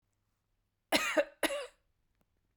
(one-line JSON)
{"cough_length": "2.6 s", "cough_amplitude": 8338, "cough_signal_mean_std_ratio": 0.34, "survey_phase": "beta (2021-08-13 to 2022-03-07)", "age": "18-44", "gender": "Female", "wearing_mask": "No", "symptom_none": true, "smoker_status": "Ex-smoker", "respiratory_condition_asthma": false, "respiratory_condition_other": false, "recruitment_source": "REACT", "submission_delay": "6 days", "covid_test_result": "Negative", "covid_test_method": "RT-qPCR"}